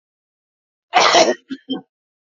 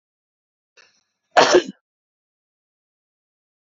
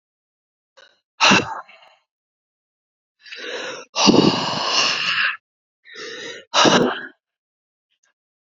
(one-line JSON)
{"cough_length": "2.2 s", "cough_amplitude": 29830, "cough_signal_mean_std_ratio": 0.38, "three_cough_length": "3.7 s", "three_cough_amplitude": 30495, "three_cough_signal_mean_std_ratio": 0.2, "exhalation_length": "8.5 s", "exhalation_amplitude": 28899, "exhalation_signal_mean_std_ratio": 0.41, "survey_phase": "beta (2021-08-13 to 2022-03-07)", "age": "18-44", "gender": "Male", "wearing_mask": "No", "symptom_none": true, "smoker_status": "Never smoked", "respiratory_condition_asthma": true, "respiratory_condition_other": false, "recruitment_source": "REACT", "submission_delay": "1 day", "covid_test_result": "Negative", "covid_test_method": "RT-qPCR", "influenza_a_test_result": "Unknown/Void", "influenza_b_test_result": "Unknown/Void"}